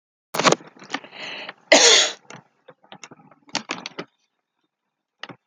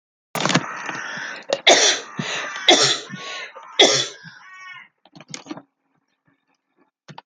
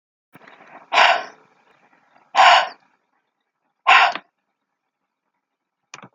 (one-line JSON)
{"cough_length": "5.5 s", "cough_amplitude": 30203, "cough_signal_mean_std_ratio": 0.3, "three_cough_length": "7.3 s", "three_cough_amplitude": 32417, "three_cough_signal_mean_std_ratio": 0.41, "exhalation_length": "6.1 s", "exhalation_amplitude": 31615, "exhalation_signal_mean_std_ratio": 0.3, "survey_phase": "alpha (2021-03-01 to 2021-08-12)", "age": "45-64", "gender": "Female", "wearing_mask": "No", "symptom_none": true, "smoker_status": "Ex-smoker", "respiratory_condition_asthma": false, "respiratory_condition_other": false, "recruitment_source": "REACT", "submission_delay": "2 days", "covid_test_result": "Negative", "covid_test_method": "RT-qPCR"}